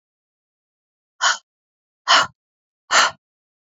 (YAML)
exhalation_length: 3.7 s
exhalation_amplitude: 27862
exhalation_signal_mean_std_ratio: 0.29
survey_phase: beta (2021-08-13 to 2022-03-07)
age: 18-44
gender: Female
wearing_mask: 'No'
symptom_none: true
smoker_status: Never smoked
respiratory_condition_asthma: true
respiratory_condition_other: false
recruitment_source: REACT
submission_delay: 2 days
covid_test_result: Negative
covid_test_method: RT-qPCR
influenza_a_test_result: Negative
influenza_b_test_result: Negative